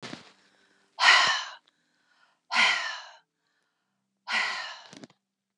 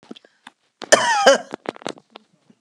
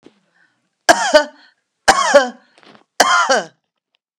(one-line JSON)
{"exhalation_length": "5.6 s", "exhalation_amplitude": 17128, "exhalation_signal_mean_std_ratio": 0.36, "cough_length": "2.6 s", "cough_amplitude": 32767, "cough_signal_mean_std_ratio": 0.33, "three_cough_length": "4.2 s", "three_cough_amplitude": 32768, "three_cough_signal_mean_std_ratio": 0.39, "survey_phase": "beta (2021-08-13 to 2022-03-07)", "age": "45-64", "gender": "Female", "wearing_mask": "No", "symptom_none": true, "smoker_status": "Ex-smoker", "respiratory_condition_asthma": false, "respiratory_condition_other": false, "recruitment_source": "REACT", "submission_delay": "1 day", "covid_test_result": "Negative", "covid_test_method": "RT-qPCR"}